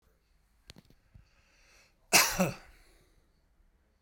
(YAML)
cough_length: 4.0 s
cough_amplitude: 12564
cough_signal_mean_std_ratio: 0.24
survey_phase: beta (2021-08-13 to 2022-03-07)
age: 65+
gender: Male
wearing_mask: 'No'
symptom_none: true
smoker_status: Ex-smoker
respiratory_condition_asthma: false
respiratory_condition_other: false
recruitment_source: Test and Trace
submission_delay: 2 days
covid_test_result: Positive
covid_test_method: RT-qPCR
covid_ct_value: 26.1
covid_ct_gene: ORF1ab gene
covid_ct_mean: 26.8
covid_viral_load: 1600 copies/ml
covid_viral_load_category: Minimal viral load (< 10K copies/ml)